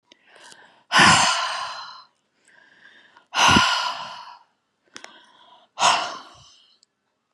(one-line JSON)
{"exhalation_length": "7.3 s", "exhalation_amplitude": 28955, "exhalation_signal_mean_std_ratio": 0.39, "survey_phase": "beta (2021-08-13 to 2022-03-07)", "age": "18-44", "gender": "Female", "wearing_mask": "No", "symptom_cough_any": true, "symptom_fever_high_temperature": true, "symptom_headache": true, "smoker_status": "Never smoked", "respiratory_condition_asthma": false, "respiratory_condition_other": false, "recruitment_source": "Test and Trace", "submission_delay": "1 day", "covid_test_result": "Positive", "covid_test_method": "RT-qPCR"}